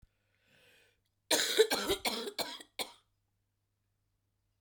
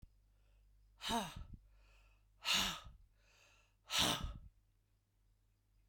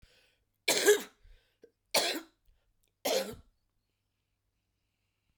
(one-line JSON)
{"cough_length": "4.6 s", "cough_amplitude": 7423, "cough_signal_mean_std_ratio": 0.34, "exhalation_length": "5.9 s", "exhalation_amplitude": 3086, "exhalation_signal_mean_std_ratio": 0.38, "three_cough_length": "5.4 s", "three_cough_amplitude": 10531, "three_cough_signal_mean_std_ratio": 0.29, "survey_phase": "beta (2021-08-13 to 2022-03-07)", "age": "45-64", "gender": "Female", "wearing_mask": "No", "symptom_cough_any": true, "symptom_new_continuous_cough": true, "symptom_runny_or_blocked_nose": true, "symptom_shortness_of_breath": true, "symptom_fatigue": true, "symptom_fever_high_temperature": true, "symptom_change_to_sense_of_smell_or_taste": true, "symptom_onset": "4 days", "smoker_status": "Never smoked", "respiratory_condition_asthma": false, "respiratory_condition_other": true, "recruitment_source": "Test and Trace", "submission_delay": "1 day", "covid_test_result": "Positive", "covid_test_method": "RT-qPCR", "covid_ct_value": 16.5, "covid_ct_gene": "ORF1ab gene", "covid_ct_mean": 16.8, "covid_viral_load": "3100000 copies/ml", "covid_viral_load_category": "High viral load (>1M copies/ml)"}